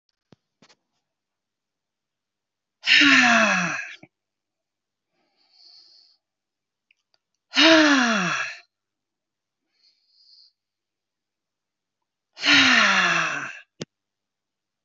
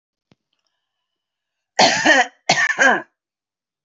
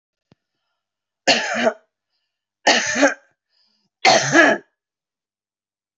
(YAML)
exhalation_length: 14.8 s
exhalation_amplitude: 25559
exhalation_signal_mean_std_ratio: 0.35
cough_length: 3.8 s
cough_amplitude: 30451
cough_signal_mean_std_ratio: 0.39
three_cough_length: 6.0 s
three_cough_amplitude: 29915
three_cough_signal_mean_std_ratio: 0.36
survey_phase: beta (2021-08-13 to 2022-03-07)
age: 45-64
gender: Female
wearing_mask: 'No'
symptom_none: true
smoker_status: Ex-smoker
respiratory_condition_asthma: false
respiratory_condition_other: false
recruitment_source: REACT
submission_delay: 1 day
covid_test_result: Negative
covid_test_method: RT-qPCR